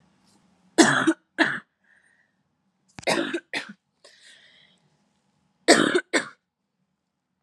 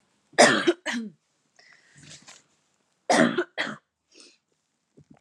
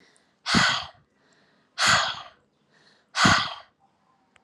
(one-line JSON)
{"three_cough_length": "7.4 s", "three_cough_amplitude": 29194, "three_cough_signal_mean_std_ratio": 0.3, "cough_length": "5.2 s", "cough_amplitude": 23938, "cough_signal_mean_std_ratio": 0.31, "exhalation_length": "4.4 s", "exhalation_amplitude": 18880, "exhalation_signal_mean_std_ratio": 0.4, "survey_phase": "alpha (2021-03-01 to 2021-08-12)", "age": "18-44", "gender": "Female", "wearing_mask": "No", "symptom_abdominal_pain": true, "symptom_diarrhoea": true, "symptom_fatigue": true, "symptom_fever_high_temperature": true, "symptom_headache": true, "symptom_change_to_sense_of_smell_or_taste": true, "symptom_onset": "4 days", "smoker_status": "Never smoked", "respiratory_condition_asthma": false, "respiratory_condition_other": false, "recruitment_source": "Test and Trace", "submission_delay": "2 days", "covid_ct_value": 21.0, "covid_ct_gene": "ORF1ab gene"}